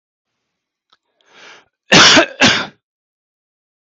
cough_length: 3.8 s
cough_amplitude: 32768
cough_signal_mean_std_ratio: 0.33
survey_phase: beta (2021-08-13 to 2022-03-07)
age: 45-64
gender: Male
wearing_mask: 'No'
symptom_none: true
smoker_status: Ex-smoker
respiratory_condition_asthma: false
respiratory_condition_other: false
recruitment_source: REACT
submission_delay: 1 day
covid_test_result: Negative
covid_test_method: RT-qPCR
influenza_a_test_result: Negative
influenza_b_test_result: Negative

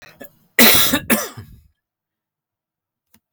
cough_length: 3.3 s
cough_amplitude: 32768
cough_signal_mean_std_ratio: 0.33
survey_phase: beta (2021-08-13 to 2022-03-07)
age: 45-64
gender: Male
wearing_mask: 'No'
symptom_runny_or_blocked_nose: true
symptom_change_to_sense_of_smell_or_taste: true
symptom_loss_of_taste: true
symptom_onset: 5 days
smoker_status: Ex-smoker
respiratory_condition_asthma: false
respiratory_condition_other: false
recruitment_source: Test and Trace
submission_delay: 2 days
covid_test_result: Positive
covid_test_method: ePCR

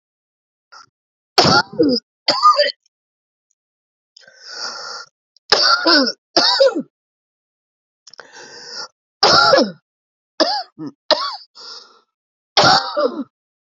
three_cough_length: 13.7 s
three_cough_amplitude: 32768
three_cough_signal_mean_std_ratio: 0.41
survey_phase: beta (2021-08-13 to 2022-03-07)
age: 18-44
gender: Female
wearing_mask: 'No'
symptom_cough_any: true
symptom_runny_or_blocked_nose: true
symptom_shortness_of_breath: true
symptom_sore_throat: true
symptom_fatigue: true
symptom_onset: 6 days
smoker_status: Ex-smoker
respiratory_condition_asthma: false
respiratory_condition_other: true
recruitment_source: REACT
submission_delay: 1 day
covid_test_result: Negative
covid_test_method: RT-qPCR
influenza_a_test_result: Negative
influenza_b_test_result: Negative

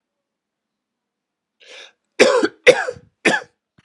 three_cough_length: 3.8 s
three_cough_amplitude: 32768
three_cough_signal_mean_std_ratio: 0.3
survey_phase: beta (2021-08-13 to 2022-03-07)
age: 65+
gender: Male
wearing_mask: 'No'
symptom_cough_any: true
symptom_runny_or_blocked_nose: true
symptom_sore_throat: true
symptom_fatigue: true
symptom_headache: true
symptom_onset: 4 days
smoker_status: Never smoked
respiratory_condition_asthma: false
respiratory_condition_other: false
recruitment_source: Test and Trace
submission_delay: 1 day
covid_test_result: Positive
covid_test_method: RT-qPCR
covid_ct_value: 13.5
covid_ct_gene: ORF1ab gene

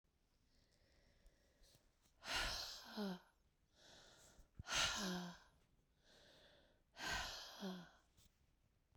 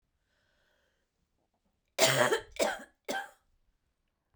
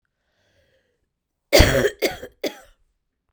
exhalation_length: 9.0 s
exhalation_amplitude: 1442
exhalation_signal_mean_std_ratio: 0.45
three_cough_length: 4.4 s
three_cough_amplitude: 9944
three_cough_signal_mean_std_ratio: 0.31
cough_length: 3.3 s
cough_amplitude: 32767
cough_signal_mean_std_ratio: 0.29
survey_phase: beta (2021-08-13 to 2022-03-07)
age: 45-64
gender: Female
wearing_mask: 'No'
symptom_cough_any: true
symptom_sore_throat: true
symptom_abdominal_pain: true
symptom_diarrhoea: true
symptom_fatigue: true
symptom_headache: true
symptom_change_to_sense_of_smell_or_taste: true
symptom_loss_of_taste: true
symptom_onset: 5 days
smoker_status: Ex-smoker
respiratory_condition_asthma: false
respiratory_condition_other: false
recruitment_source: Test and Trace
submission_delay: 2 days
covid_test_result: Positive
covid_test_method: ePCR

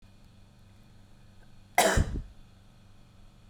cough_length: 3.5 s
cough_amplitude: 12698
cough_signal_mean_std_ratio: 0.33
survey_phase: beta (2021-08-13 to 2022-03-07)
age: 18-44
gender: Female
wearing_mask: 'Yes'
symptom_none: true
smoker_status: Never smoked
respiratory_condition_asthma: false
respiratory_condition_other: false
recruitment_source: REACT
submission_delay: 0 days
covid_test_result: Negative
covid_test_method: RT-qPCR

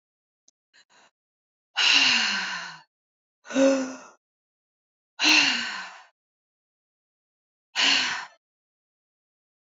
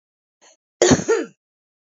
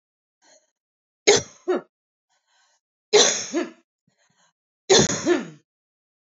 exhalation_length: 9.7 s
exhalation_amplitude: 17311
exhalation_signal_mean_std_ratio: 0.38
cough_length: 2.0 s
cough_amplitude: 31101
cough_signal_mean_std_ratio: 0.33
three_cough_length: 6.4 s
three_cough_amplitude: 28535
three_cough_signal_mean_std_ratio: 0.32
survey_phase: beta (2021-08-13 to 2022-03-07)
age: 45-64
gender: Female
wearing_mask: 'No'
symptom_new_continuous_cough: true
symptom_diarrhoea: true
symptom_headache: true
smoker_status: Current smoker (11 or more cigarettes per day)
respiratory_condition_asthma: false
respiratory_condition_other: false
recruitment_source: Test and Trace
submission_delay: 1 day
covid_test_result: Positive
covid_test_method: RT-qPCR
covid_ct_value: 27.5
covid_ct_gene: ORF1ab gene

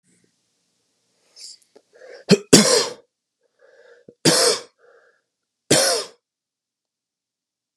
three_cough_length: 7.8 s
three_cough_amplitude: 32768
three_cough_signal_mean_std_ratio: 0.29
survey_phase: beta (2021-08-13 to 2022-03-07)
age: 18-44
gender: Male
wearing_mask: 'No'
symptom_runny_or_blocked_nose: true
symptom_change_to_sense_of_smell_or_taste: true
symptom_loss_of_taste: true
smoker_status: Never smoked
respiratory_condition_asthma: false
respiratory_condition_other: false
recruitment_source: Test and Trace
submission_delay: 1 day
covid_test_result: Positive
covid_test_method: RT-qPCR
covid_ct_value: 26.1
covid_ct_gene: ORF1ab gene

